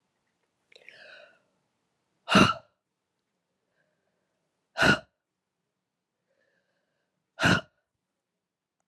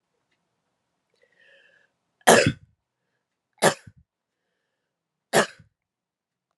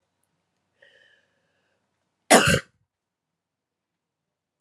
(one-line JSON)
{"exhalation_length": "8.9 s", "exhalation_amplitude": 16307, "exhalation_signal_mean_std_ratio": 0.21, "three_cough_length": "6.6 s", "three_cough_amplitude": 32326, "three_cough_signal_mean_std_ratio": 0.2, "cough_length": "4.6 s", "cough_amplitude": 31038, "cough_signal_mean_std_ratio": 0.19, "survey_phase": "beta (2021-08-13 to 2022-03-07)", "age": "45-64", "gender": "Female", "wearing_mask": "No", "symptom_cough_any": true, "symptom_fatigue": true, "symptom_headache": true, "symptom_change_to_sense_of_smell_or_taste": true, "symptom_loss_of_taste": true, "smoker_status": "Never smoked", "respiratory_condition_asthma": false, "respiratory_condition_other": false, "recruitment_source": "Test and Trace", "submission_delay": "2 days", "covid_test_result": "Positive", "covid_test_method": "RT-qPCR"}